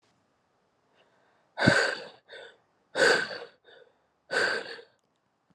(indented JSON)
{
  "exhalation_length": "5.5 s",
  "exhalation_amplitude": 19062,
  "exhalation_signal_mean_std_ratio": 0.36,
  "survey_phase": "alpha (2021-03-01 to 2021-08-12)",
  "age": "18-44",
  "gender": "Female",
  "wearing_mask": "No",
  "symptom_cough_any": true,
  "symptom_fatigue": true,
  "symptom_headache": true,
  "symptom_loss_of_taste": true,
  "symptom_onset": "4 days",
  "smoker_status": "Never smoked",
  "respiratory_condition_asthma": false,
  "respiratory_condition_other": false,
  "recruitment_source": "Test and Trace",
  "submission_delay": "2 days",
  "covid_test_result": "Positive",
  "covid_test_method": "RT-qPCR"
}